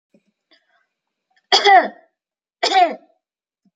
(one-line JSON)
{"cough_length": "3.8 s", "cough_amplitude": 32767, "cough_signal_mean_std_ratio": 0.31, "survey_phase": "alpha (2021-03-01 to 2021-08-12)", "age": "18-44", "gender": "Female", "wearing_mask": "No", "symptom_none": true, "smoker_status": "Never smoked", "respiratory_condition_asthma": false, "respiratory_condition_other": false, "recruitment_source": "REACT", "submission_delay": "6 days", "covid_test_result": "Negative", "covid_test_method": "RT-qPCR"}